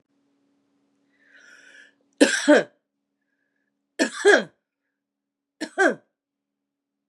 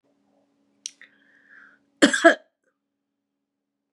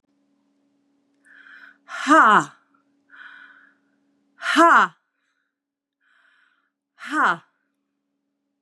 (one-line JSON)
{"three_cough_length": "7.1 s", "three_cough_amplitude": 26738, "three_cough_signal_mean_std_ratio": 0.26, "cough_length": "3.9 s", "cough_amplitude": 31531, "cough_signal_mean_std_ratio": 0.19, "exhalation_length": "8.6 s", "exhalation_amplitude": 25558, "exhalation_signal_mean_std_ratio": 0.28, "survey_phase": "beta (2021-08-13 to 2022-03-07)", "age": "65+", "gender": "Female", "wearing_mask": "No", "symptom_cough_any": true, "symptom_runny_or_blocked_nose": true, "symptom_headache": true, "symptom_onset": "4 days", "smoker_status": "Never smoked", "respiratory_condition_asthma": false, "respiratory_condition_other": false, "recruitment_source": "REACT", "submission_delay": "4 days", "covid_test_result": "Negative", "covid_test_method": "RT-qPCR", "influenza_a_test_result": "Negative", "influenza_b_test_result": "Negative"}